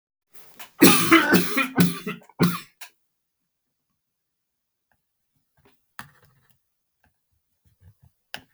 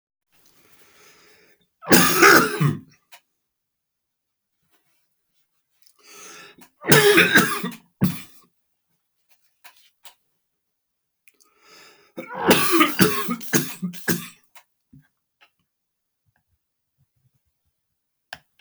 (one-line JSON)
{"cough_length": "8.5 s", "cough_amplitude": 32768, "cough_signal_mean_std_ratio": 0.29, "three_cough_length": "18.6 s", "three_cough_amplitude": 32768, "three_cough_signal_mean_std_ratio": 0.31, "survey_phase": "beta (2021-08-13 to 2022-03-07)", "age": "65+", "gender": "Male", "wearing_mask": "No", "symptom_cough_any": true, "symptom_runny_or_blocked_nose": true, "smoker_status": "Ex-smoker", "respiratory_condition_asthma": false, "respiratory_condition_other": true, "recruitment_source": "REACT", "submission_delay": "1 day", "covid_test_result": "Negative", "covid_test_method": "RT-qPCR", "influenza_a_test_result": "Negative", "influenza_b_test_result": "Negative"}